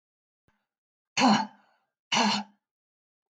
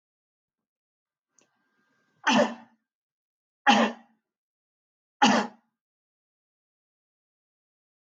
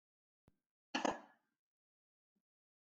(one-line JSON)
{"exhalation_length": "3.3 s", "exhalation_amplitude": 11019, "exhalation_signal_mean_std_ratio": 0.34, "three_cough_length": "8.0 s", "three_cough_amplitude": 14398, "three_cough_signal_mean_std_ratio": 0.24, "cough_length": "2.9 s", "cough_amplitude": 2676, "cough_signal_mean_std_ratio": 0.19, "survey_phase": "beta (2021-08-13 to 2022-03-07)", "age": "65+", "gender": "Male", "wearing_mask": "No", "symptom_cough_any": true, "symptom_runny_or_blocked_nose": true, "symptom_sore_throat": true, "symptom_fatigue": true, "smoker_status": "Never smoked", "respiratory_condition_asthma": false, "respiratory_condition_other": false, "recruitment_source": "Test and Trace", "submission_delay": "1 day", "covid_test_result": "Positive", "covid_test_method": "RT-qPCR", "covid_ct_value": 19.1, "covid_ct_gene": "ORF1ab gene", "covid_ct_mean": 19.5, "covid_viral_load": "410000 copies/ml", "covid_viral_load_category": "Low viral load (10K-1M copies/ml)"}